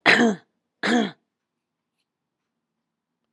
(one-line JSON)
{"exhalation_length": "3.3 s", "exhalation_amplitude": 29217, "exhalation_signal_mean_std_ratio": 0.32, "survey_phase": "alpha (2021-03-01 to 2021-08-12)", "age": "45-64", "gender": "Female", "wearing_mask": "No", "symptom_cough_any": true, "symptom_shortness_of_breath": true, "symptom_fatigue": true, "symptom_headache": true, "symptom_change_to_sense_of_smell_or_taste": true, "symptom_loss_of_taste": true, "smoker_status": "Current smoker (1 to 10 cigarettes per day)", "respiratory_condition_asthma": false, "respiratory_condition_other": false, "recruitment_source": "Test and Trace", "submission_delay": "2 days", "covid_test_result": "Positive", "covid_test_method": "RT-qPCR"}